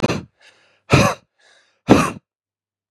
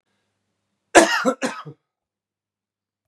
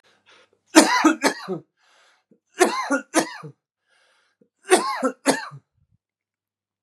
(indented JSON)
{
  "exhalation_length": "2.9 s",
  "exhalation_amplitude": 32768,
  "exhalation_signal_mean_std_ratio": 0.34,
  "cough_length": "3.1 s",
  "cough_amplitude": 32768,
  "cough_signal_mean_std_ratio": 0.26,
  "three_cough_length": "6.8 s",
  "three_cough_amplitude": 32768,
  "three_cough_signal_mean_std_ratio": 0.35,
  "survey_phase": "beta (2021-08-13 to 2022-03-07)",
  "age": "45-64",
  "gender": "Male",
  "wearing_mask": "No",
  "symptom_cough_any": true,
  "symptom_runny_or_blocked_nose": true,
  "symptom_change_to_sense_of_smell_or_taste": true,
  "symptom_loss_of_taste": true,
  "symptom_onset": "3 days",
  "smoker_status": "Ex-smoker",
  "respiratory_condition_asthma": false,
  "respiratory_condition_other": false,
  "recruitment_source": "Test and Trace",
  "submission_delay": "2 days",
  "covid_test_result": "Positive",
  "covid_test_method": "ePCR"
}